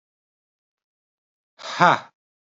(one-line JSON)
{"exhalation_length": "2.5 s", "exhalation_amplitude": 27939, "exhalation_signal_mean_std_ratio": 0.21, "survey_phase": "beta (2021-08-13 to 2022-03-07)", "age": "18-44", "gender": "Male", "wearing_mask": "No", "symptom_cough_any": true, "symptom_sore_throat": true, "symptom_onset": "4 days", "smoker_status": "Never smoked", "respiratory_condition_asthma": false, "respiratory_condition_other": false, "recruitment_source": "Test and Trace", "submission_delay": "1 day", "covid_test_result": "Positive", "covid_test_method": "RT-qPCR", "covid_ct_value": 29.9, "covid_ct_gene": "N gene", "covid_ct_mean": 30.0, "covid_viral_load": "150 copies/ml", "covid_viral_load_category": "Minimal viral load (< 10K copies/ml)"}